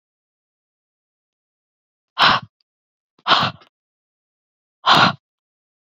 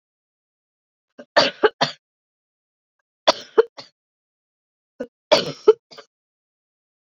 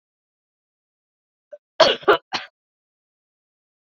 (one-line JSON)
{"exhalation_length": "6.0 s", "exhalation_amplitude": 31701, "exhalation_signal_mean_std_ratio": 0.27, "three_cough_length": "7.2 s", "three_cough_amplitude": 30955, "three_cough_signal_mean_std_ratio": 0.21, "cough_length": "3.8 s", "cough_amplitude": 29647, "cough_signal_mean_std_ratio": 0.21, "survey_phase": "beta (2021-08-13 to 2022-03-07)", "age": "45-64", "gender": "Female", "wearing_mask": "No", "symptom_none": true, "smoker_status": "Never smoked", "respiratory_condition_asthma": false, "respiratory_condition_other": false, "recruitment_source": "REACT", "submission_delay": "8 days", "covid_test_result": "Negative", "covid_test_method": "RT-qPCR"}